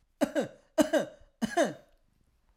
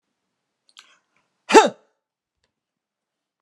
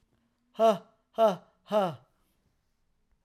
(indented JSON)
{
  "three_cough_length": "2.6 s",
  "three_cough_amplitude": 10485,
  "three_cough_signal_mean_std_ratio": 0.39,
  "cough_length": "3.4 s",
  "cough_amplitude": 32767,
  "cough_signal_mean_std_ratio": 0.17,
  "exhalation_length": "3.2 s",
  "exhalation_amplitude": 8066,
  "exhalation_signal_mean_std_ratio": 0.34,
  "survey_phase": "alpha (2021-03-01 to 2021-08-12)",
  "age": "45-64",
  "gender": "Male",
  "wearing_mask": "No",
  "symptom_none": true,
  "smoker_status": "Never smoked",
  "respiratory_condition_asthma": false,
  "respiratory_condition_other": false,
  "recruitment_source": "REACT",
  "submission_delay": "5 days",
  "covid_test_result": "Negative",
  "covid_test_method": "RT-qPCR"
}